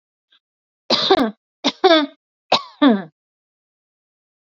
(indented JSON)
{
  "three_cough_length": "4.5 s",
  "three_cough_amplitude": 27250,
  "three_cough_signal_mean_std_ratio": 0.35,
  "survey_phase": "beta (2021-08-13 to 2022-03-07)",
  "age": "45-64",
  "gender": "Female",
  "wearing_mask": "No",
  "symptom_none": true,
  "smoker_status": "Never smoked",
  "respiratory_condition_asthma": false,
  "respiratory_condition_other": false,
  "recruitment_source": "REACT",
  "submission_delay": "1 day",
  "covid_test_result": "Negative",
  "covid_test_method": "RT-qPCR",
  "influenza_a_test_result": "Negative",
  "influenza_b_test_result": "Negative"
}